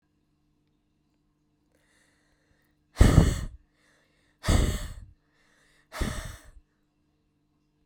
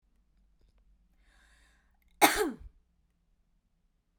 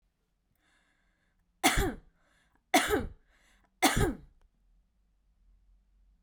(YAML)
exhalation_length: 7.9 s
exhalation_amplitude: 21571
exhalation_signal_mean_std_ratio: 0.26
cough_length: 4.2 s
cough_amplitude: 15702
cough_signal_mean_std_ratio: 0.2
three_cough_length: 6.2 s
three_cough_amplitude: 12624
three_cough_signal_mean_std_ratio: 0.3
survey_phase: beta (2021-08-13 to 2022-03-07)
age: 18-44
gender: Female
wearing_mask: 'No'
symptom_none: true
smoker_status: Prefer not to say
respiratory_condition_asthma: false
respiratory_condition_other: false
recruitment_source: REACT
submission_delay: 2 days
covid_test_result: Negative
covid_test_method: RT-qPCR